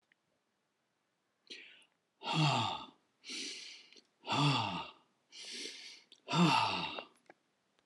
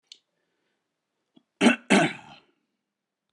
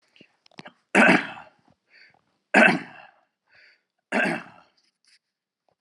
{"exhalation_length": "7.9 s", "exhalation_amplitude": 5006, "exhalation_signal_mean_std_ratio": 0.44, "cough_length": "3.3 s", "cough_amplitude": 20290, "cough_signal_mean_std_ratio": 0.26, "three_cough_length": "5.8 s", "three_cough_amplitude": 24775, "three_cough_signal_mean_std_ratio": 0.29, "survey_phase": "alpha (2021-03-01 to 2021-08-12)", "age": "65+", "gender": "Male", "wearing_mask": "No", "symptom_none": true, "smoker_status": "Never smoked", "respiratory_condition_asthma": false, "respiratory_condition_other": false, "recruitment_source": "REACT", "submission_delay": "3 days", "covid_test_result": "Negative", "covid_test_method": "RT-qPCR"}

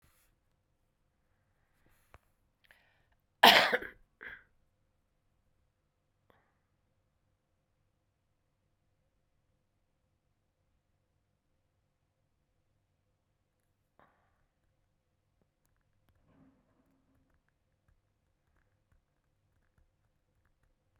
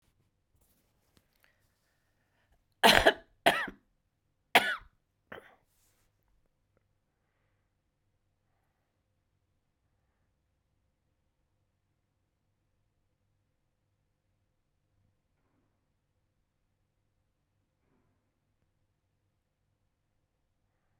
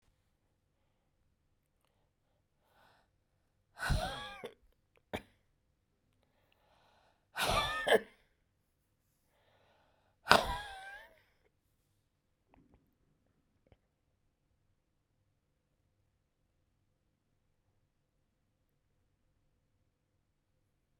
{"cough_length": "21.0 s", "cough_amplitude": 19480, "cough_signal_mean_std_ratio": 0.1, "three_cough_length": "21.0 s", "three_cough_amplitude": 25936, "three_cough_signal_mean_std_ratio": 0.13, "exhalation_length": "21.0 s", "exhalation_amplitude": 22528, "exhalation_signal_mean_std_ratio": 0.19, "survey_phase": "beta (2021-08-13 to 2022-03-07)", "age": "65+", "gender": "Female", "wearing_mask": "No", "symptom_cough_any": true, "symptom_fatigue": true, "symptom_change_to_sense_of_smell_or_taste": true, "symptom_loss_of_taste": true, "symptom_onset": "7 days", "smoker_status": "Ex-smoker", "respiratory_condition_asthma": false, "respiratory_condition_other": true, "recruitment_source": "Test and Trace", "submission_delay": "1 day", "covid_test_result": "Positive", "covid_test_method": "RT-qPCR", "covid_ct_value": 19.1, "covid_ct_gene": "ORF1ab gene", "covid_ct_mean": 19.6, "covid_viral_load": "360000 copies/ml", "covid_viral_load_category": "Low viral load (10K-1M copies/ml)"}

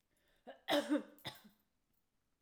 {"cough_length": "2.4 s", "cough_amplitude": 2999, "cough_signal_mean_std_ratio": 0.32, "survey_phase": "alpha (2021-03-01 to 2021-08-12)", "age": "45-64", "gender": "Female", "wearing_mask": "No", "symptom_none": true, "smoker_status": "Ex-smoker", "respiratory_condition_asthma": false, "respiratory_condition_other": false, "recruitment_source": "REACT", "submission_delay": "2 days", "covid_test_result": "Negative", "covid_test_method": "RT-qPCR"}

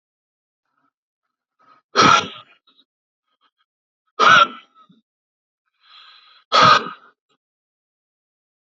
{"exhalation_length": "8.8 s", "exhalation_amplitude": 29361, "exhalation_signal_mean_std_ratio": 0.26, "survey_phase": "beta (2021-08-13 to 2022-03-07)", "age": "18-44", "gender": "Male", "wearing_mask": "No", "symptom_none": true, "smoker_status": "Never smoked", "respiratory_condition_asthma": true, "respiratory_condition_other": false, "recruitment_source": "REACT", "submission_delay": "2 days", "covid_test_result": "Negative", "covid_test_method": "RT-qPCR", "influenza_a_test_result": "Negative", "influenza_b_test_result": "Negative"}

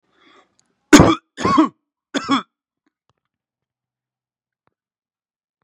{"three_cough_length": "5.6 s", "three_cough_amplitude": 32768, "three_cough_signal_mean_std_ratio": 0.25, "survey_phase": "beta (2021-08-13 to 2022-03-07)", "age": "18-44", "gender": "Male", "wearing_mask": "No", "symptom_fatigue": true, "symptom_headache": true, "smoker_status": "Ex-smoker", "respiratory_condition_asthma": false, "respiratory_condition_other": false, "recruitment_source": "Test and Trace", "submission_delay": "1 day", "covid_test_result": "Positive", "covid_test_method": "RT-qPCR"}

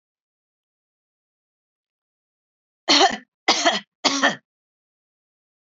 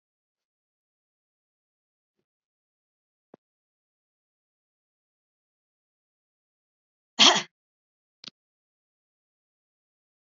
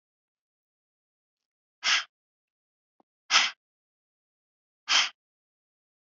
{"three_cough_length": "5.6 s", "three_cough_amplitude": 25200, "three_cough_signal_mean_std_ratio": 0.29, "cough_length": "10.3 s", "cough_amplitude": 25408, "cough_signal_mean_std_ratio": 0.11, "exhalation_length": "6.1 s", "exhalation_amplitude": 17921, "exhalation_signal_mean_std_ratio": 0.23, "survey_phase": "beta (2021-08-13 to 2022-03-07)", "age": "45-64", "gender": "Female", "wearing_mask": "No", "symptom_none": true, "symptom_onset": "3 days", "smoker_status": "Never smoked", "respiratory_condition_asthma": false, "respiratory_condition_other": false, "recruitment_source": "REACT", "submission_delay": "2 days", "covid_test_result": "Negative", "covid_test_method": "RT-qPCR", "influenza_a_test_result": "Negative", "influenza_b_test_result": "Negative"}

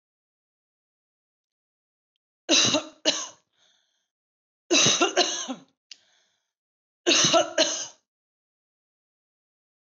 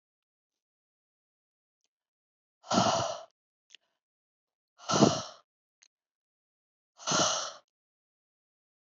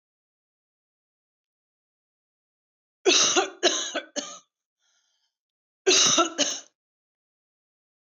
{"three_cough_length": "9.8 s", "three_cough_amplitude": 13812, "three_cough_signal_mean_std_ratio": 0.34, "exhalation_length": "8.9 s", "exhalation_amplitude": 14421, "exhalation_signal_mean_std_ratio": 0.27, "cough_length": "8.1 s", "cough_amplitude": 13130, "cough_signal_mean_std_ratio": 0.32, "survey_phase": "alpha (2021-03-01 to 2021-08-12)", "age": "18-44", "gender": "Female", "wearing_mask": "No", "symptom_none": true, "smoker_status": "Current smoker (e-cigarettes or vapes only)", "respiratory_condition_asthma": false, "respiratory_condition_other": false, "recruitment_source": "REACT", "submission_delay": "3 days", "covid_test_result": "Negative", "covid_test_method": "RT-qPCR"}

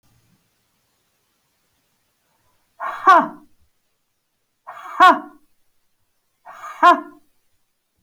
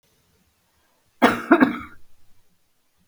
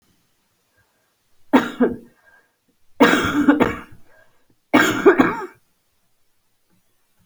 {"exhalation_length": "8.0 s", "exhalation_amplitude": 30231, "exhalation_signal_mean_std_ratio": 0.23, "cough_length": "3.1 s", "cough_amplitude": 30551, "cough_signal_mean_std_ratio": 0.29, "three_cough_length": "7.3 s", "three_cough_amplitude": 27505, "three_cough_signal_mean_std_ratio": 0.36, "survey_phase": "beta (2021-08-13 to 2022-03-07)", "age": "45-64", "gender": "Female", "wearing_mask": "No", "symptom_cough_any": true, "symptom_runny_or_blocked_nose": true, "symptom_headache": true, "smoker_status": "Never smoked", "respiratory_condition_asthma": false, "respiratory_condition_other": false, "recruitment_source": "Test and Trace", "submission_delay": "1 day", "covid_test_result": "Positive", "covid_test_method": "RT-qPCR", "covid_ct_value": 16.8, "covid_ct_gene": "ORF1ab gene", "covid_ct_mean": 17.4, "covid_viral_load": "1900000 copies/ml", "covid_viral_load_category": "High viral load (>1M copies/ml)"}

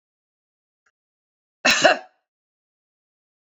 {"cough_length": "3.5 s", "cough_amplitude": 27146, "cough_signal_mean_std_ratio": 0.22, "survey_phase": "beta (2021-08-13 to 2022-03-07)", "age": "18-44", "gender": "Female", "wearing_mask": "No", "symptom_runny_or_blocked_nose": true, "smoker_status": "Ex-smoker", "respiratory_condition_asthma": false, "respiratory_condition_other": false, "recruitment_source": "REACT", "submission_delay": "2 days", "covid_test_result": "Negative", "covid_test_method": "RT-qPCR", "influenza_a_test_result": "Negative", "influenza_b_test_result": "Negative"}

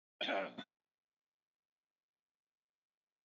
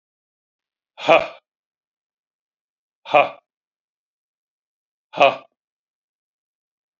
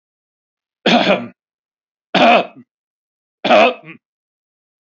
{"cough_length": "3.2 s", "cough_amplitude": 1692, "cough_signal_mean_std_ratio": 0.25, "exhalation_length": "7.0 s", "exhalation_amplitude": 27510, "exhalation_signal_mean_std_ratio": 0.19, "three_cough_length": "4.9 s", "three_cough_amplitude": 29382, "three_cough_signal_mean_std_ratio": 0.36, "survey_phase": "beta (2021-08-13 to 2022-03-07)", "age": "45-64", "gender": "Male", "wearing_mask": "No", "symptom_none": true, "smoker_status": "Never smoked", "respiratory_condition_asthma": false, "respiratory_condition_other": false, "recruitment_source": "REACT", "submission_delay": "1 day", "covid_test_result": "Negative", "covid_test_method": "RT-qPCR", "influenza_a_test_result": "Negative", "influenza_b_test_result": "Negative"}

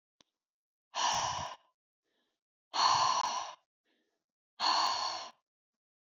{"exhalation_length": "6.1 s", "exhalation_amplitude": 5152, "exhalation_signal_mean_std_ratio": 0.46, "survey_phase": "alpha (2021-03-01 to 2021-08-12)", "age": "45-64", "gender": "Female", "wearing_mask": "No", "symptom_none": true, "smoker_status": "Ex-smoker", "respiratory_condition_asthma": false, "respiratory_condition_other": false, "recruitment_source": "REACT", "submission_delay": "1 day", "covid_test_result": "Negative", "covid_test_method": "RT-qPCR"}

